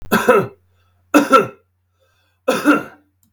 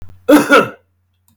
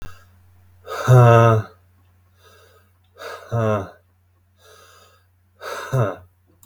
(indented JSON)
{
  "three_cough_length": "3.3 s",
  "three_cough_amplitude": 32768,
  "three_cough_signal_mean_std_ratio": 0.42,
  "cough_length": "1.4 s",
  "cough_amplitude": 32768,
  "cough_signal_mean_std_ratio": 0.44,
  "exhalation_length": "6.7 s",
  "exhalation_amplitude": 32478,
  "exhalation_signal_mean_std_ratio": 0.34,
  "survey_phase": "beta (2021-08-13 to 2022-03-07)",
  "age": "18-44",
  "gender": "Male",
  "wearing_mask": "No",
  "symptom_sore_throat": true,
  "smoker_status": "Current smoker (11 or more cigarettes per day)",
  "respiratory_condition_asthma": false,
  "respiratory_condition_other": false,
  "recruitment_source": "REACT",
  "submission_delay": "2 days",
  "covid_test_result": "Negative",
  "covid_test_method": "RT-qPCR",
  "influenza_a_test_result": "Negative",
  "influenza_b_test_result": "Negative"
}